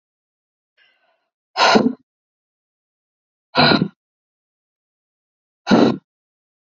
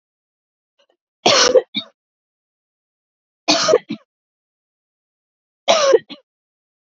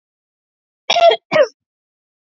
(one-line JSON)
{"exhalation_length": "6.7 s", "exhalation_amplitude": 28476, "exhalation_signal_mean_std_ratio": 0.29, "three_cough_length": "7.0 s", "three_cough_amplitude": 31356, "three_cough_signal_mean_std_ratio": 0.3, "cough_length": "2.2 s", "cough_amplitude": 28629, "cough_signal_mean_std_ratio": 0.34, "survey_phase": "beta (2021-08-13 to 2022-03-07)", "age": "18-44", "gender": "Female", "wearing_mask": "No", "symptom_runny_or_blocked_nose": true, "symptom_onset": "4 days", "smoker_status": "Never smoked", "respiratory_condition_asthma": false, "respiratory_condition_other": false, "recruitment_source": "Test and Trace", "submission_delay": "2 days", "covid_test_result": "Positive", "covid_test_method": "RT-qPCR", "covid_ct_value": 27.7, "covid_ct_gene": "ORF1ab gene"}